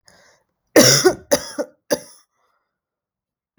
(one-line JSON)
{"three_cough_length": "3.6 s", "three_cough_amplitude": 32768, "three_cough_signal_mean_std_ratio": 0.3, "survey_phase": "beta (2021-08-13 to 2022-03-07)", "age": "18-44", "gender": "Female", "wearing_mask": "No", "symptom_cough_any": true, "symptom_runny_or_blocked_nose": true, "symptom_sore_throat": true, "symptom_fatigue": true, "symptom_onset": "7 days", "smoker_status": "Never smoked", "respiratory_condition_asthma": false, "respiratory_condition_other": false, "recruitment_source": "Test and Trace", "submission_delay": "2 days", "covid_test_result": "Positive", "covid_test_method": "RT-qPCR", "covid_ct_value": 18.1, "covid_ct_gene": "N gene"}